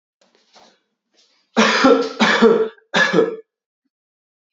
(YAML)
three_cough_length: 4.5 s
three_cough_amplitude: 27597
three_cough_signal_mean_std_ratio: 0.46
survey_phase: beta (2021-08-13 to 2022-03-07)
age: 18-44
gender: Male
wearing_mask: 'No'
symptom_none: true
smoker_status: Never smoked
respiratory_condition_asthma: false
respiratory_condition_other: false
recruitment_source: REACT
submission_delay: 3 days
covid_test_result: Negative
covid_test_method: RT-qPCR
influenza_a_test_result: Negative
influenza_b_test_result: Negative